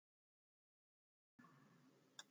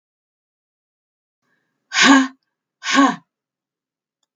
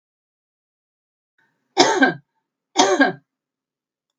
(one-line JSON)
{"cough_length": "2.3 s", "cough_amplitude": 332, "cough_signal_mean_std_ratio": 0.35, "exhalation_length": "4.4 s", "exhalation_amplitude": 32768, "exhalation_signal_mean_std_ratio": 0.29, "three_cough_length": "4.2 s", "three_cough_amplitude": 32767, "three_cough_signal_mean_std_ratio": 0.31, "survey_phase": "beta (2021-08-13 to 2022-03-07)", "age": "65+", "gender": "Female", "wearing_mask": "No", "symptom_none": true, "smoker_status": "Never smoked", "respiratory_condition_asthma": true, "respiratory_condition_other": false, "recruitment_source": "REACT", "submission_delay": "3 days", "covid_test_result": "Negative", "covid_test_method": "RT-qPCR", "influenza_a_test_result": "Negative", "influenza_b_test_result": "Negative"}